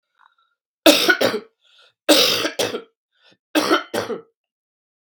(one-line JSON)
{"three_cough_length": "5.0 s", "three_cough_amplitude": 32768, "three_cough_signal_mean_std_ratio": 0.41, "survey_phase": "beta (2021-08-13 to 2022-03-07)", "age": "45-64", "gender": "Female", "wearing_mask": "No", "symptom_cough_any": true, "symptom_runny_or_blocked_nose": true, "symptom_headache": true, "symptom_change_to_sense_of_smell_or_taste": true, "symptom_loss_of_taste": true, "symptom_onset": "4 days", "smoker_status": "Never smoked", "respiratory_condition_asthma": false, "respiratory_condition_other": false, "recruitment_source": "Test and Trace", "submission_delay": "2 days", "covid_test_result": "Positive", "covid_test_method": "RT-qPCR", "covid_ct_value": 19.6, "covid_ct_gene": "ORF1ab gene", "covid_ct_mean": 19.9, "covid_viral_load": "290000 copies/ml", "covid_viral_load_category": "Low viral load (10K-1M copies/ml)"}